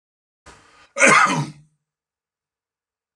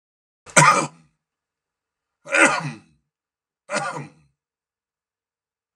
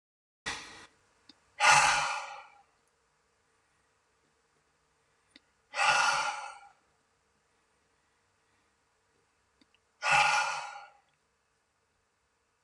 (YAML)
cough_length: 3.2 s
cough_amplitude: 31555
cough_signal_mean_std_ratio: 0.3
three_cough_length: 5.8 s
three_cough_amplitude: 32768
three_cough_signal_mean_std_ratio: 0.28
exhalation_length: 12.6 s
exhalation_amplitude: 12855
exhalation_signal_mean_std_ratio: 0.31
survey_phase: beta (2021-08-13 to 2022-03-07)
age: 65+
gender: Male
wearing_mask: 'No'
symptom_none: true
smoker_status: Never smoked
respiratory_condition_asthma: false
respiratory_condition_other: false
recruitment_source: REACT
submission_delay: 5 days
covid_test_result: Negative
covid_test_method: RT-qPCR
influenza_a_test_result: Negative
influenza_b_test_result: Negative